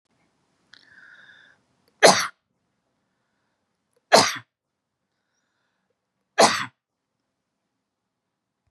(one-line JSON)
{"three_cough_length": "8.7 s", "three_cough_amplitude": 32767, "three_cough_signal_mean_std_ratio": 0.19, "survey_phase": "beta (2021-08-13 to 2022-03-07)", "age": "65+", "gender": "Female", "wearing_mask": "No", "symptom_none": true, "smoker_status": "Never smoked", "respiratory_condition_asthma": false, "respiratory_condition_other": false, "recruitment_source": "REACT", "submission_delay": "2 days", "covid_test_result": "Negative", "covid_test_method": "RT-qPCR", "influenza_a_test_result": "Negative", "influenza_b_test_result": "Negative"}